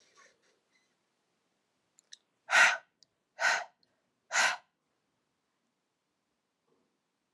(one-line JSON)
{"exhalation_length": "7.3 s", "exhalation_amplitude": 11265, "exhalation_signal_mean_std_ratio": 0.24, "survey_phase": "alpha (2021-03-01 to 2021-08-12)", "age": "18-44", "gender": "Female", "wearing_mask": "No", "symptom_cough_any": true, "symptom_shortness_of_breath": true, "symptom_fatigue": true, "symptom_headache": true, "symptom_change_to_sense_of_smell_or_taste": true, "smoker_status": "Ex-smoker", "respiratory_condition_asthma": false, "respiratory_condition_other": false, "recruitment_source": "Test and Trace", "submission_delay": "1 day", "covid_test_result": "Positive", "covid_test_method": "RT-qPCR"}